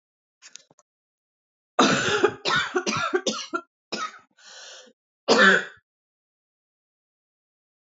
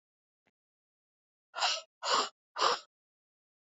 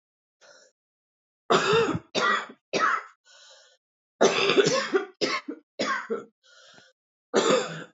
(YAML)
cough_length: 7.9 s
cough_amplitude: 22346
cough_signal_mean_std_ratio: 0.37
exhalation_length: 3.8 s
exhalation_amplitude: 5616
exhalation_signal_mean_std_ratio: 0.33
three_cough_length: 7.9 s
three_cough_amplitude: 16885
three_cough_signal_mean_std_ratio: 0.49
survey_phase: alpha (2021-03-01 to 2021-08-12)
age: 18-44
gender: Female
wearing_mask: 'No'
symptom_cough_any: true
symptom_new_continuous_cough: true
symptom_shortness_of_breath: true
symptom_fatigue: true
symptom_headache: true
symptom_change_to_sense_of_smell_or_taste: true
symptom_loss_of_taste: true
symptom_onset: 4 days
smoker_status: Ex-smoker
respiratory_condition_asthma: true
respiratory_condition_other: false
recruitment_source: Test and Trace
submission_delay: 2 days
covid_test_result: Positive
covid_test_method: RT-qPCR
covid_ct_value: 12.7
covid_ct_gene: ORF1ab gene
covid_ct_mean: 13.0
covid_viral_load: 54000000 copies/ml
covid_viral_load_category: High viral load (>1M copies/ml)